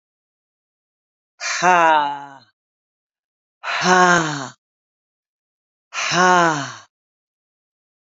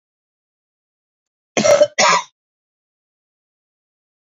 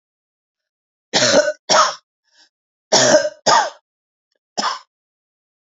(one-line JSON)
{"exhalation_length": "8.1 s", "exhalation_amplitude": 28141, "exhalation_signal_mean_std_ratio": 0.37, "cough_length": "4.3 s", "cough_amplitude": 28025, "cough_signal_mean_std_ratio": 0.28, "three_cough_length": "5.6 s", "three_cough_amplitude": 30706, "three_cough_signal_mean_std_ratio": 0.39, "survey_phase": "beta (2021-08-13 to 2022-03-07)", "age": "65+", "gender": "Female", "wearing_mask": "No", "symptom_cough_any": true, "symptom_sore_throat": true, "symptom_onset": "1 day", "smoker_status": "Never smoked", "respiratory_condition_asthma": false, "respiratory_condition_other": false, "recruitment_source": "Test and Trace", "submission_delay": "1 day", "covid_test_result": "Negative", "covid_test_method": "RT-qPCR"}